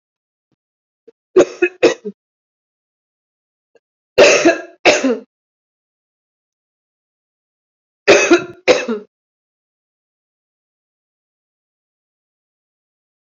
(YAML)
three_cough_length: 13.2 s
three_cough_amplitude: 29741
three_cough_signal_mean_std_ratio: 0.27
survey_phase: beta (2021-08-13 to 2022-03-07)
age: 45-64
gender: Female
wearing_mask: 'Yes'
symptom_cough_any: true
symptom_runny_or_blocked_nose: true
symptom_shortness_of_breath: true
symptom_fatigue: true
symptom_headache: true
symptom_change_to_sense_of_smell_or_taste: true
smoker_status: Never smoked
respiratory_condition_asthma: false
respiratory_condition_other: false
recruitment_source: Test and Trace
submission_delay: 1 day
covid_test_result: Positive
covid_test_method: RT-qPCR
covid_ct_value: 17.3
covid_ct_gene: ORF1ab gene
covid_ct_mean: 17.8
covid_viral_load: 1400000 copies/ml
covid_viral_load_category: High viral load (>1M copies/ml)